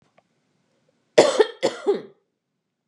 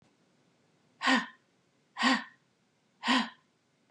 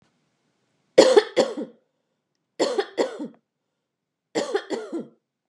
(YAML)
cough_length: 2.9 s
cough_amplitude: 31695
cough_signal_mean_std_ratio: 0.3
exhalation_length: 3.9 s
exhalation_amplitude: 7643
exhalation_signal_mean_std_ratio: 0.34
three_cough_length: 5.5 s
three_cough_amplitude: 32331
three_cough_signal_mean_std_ratio: 0.32
survey_phase: beta (2021-08-13 to 2022-03-07)
age: 45-64
gender: Female
wearing_mask: 'No'
symptom_cough_any: true
smoker_status: Never smoked
respiratory_condition_asthma: false
respiratory_condition_other: false
recruitment_source: Test and Trace
submission_delay: 5 days
covid_test_result: Negative
covid_test_method: RT-qPCR